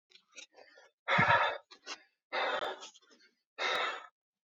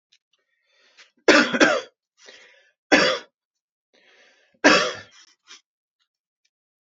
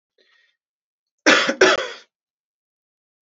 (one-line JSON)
{"exhalation_length": "4.4 s", "exhalation_amplitude": 7813, "exhalation_signal_mean_std_ratio": 0.45, "three_cough_length": "7.0 s", "three_cough_amplitude": 29537, "three_cough_signal_mean_std_ratio": 0.29, "cough_length": "3.2 s", "cough_amplitude": 32767, "cough_signal_mean_std_ratio": 0.3, "survey_phase": "alpha (2021-03-01 to 2021-08-12)", "age": "18-44", "gender": "Male", "wearing_mask": "No", "symptom_none": true, "smoker_status": "Current smoker (e-cigarettes or vapes only)", "respiratory_condition_asthma": false, "respiratory_condition_other": false, "recruitment_source": "REACT", "submission_delay": "1 day", "covid_test_result": "Negative", "covid_test_method": "RT-qPCR"}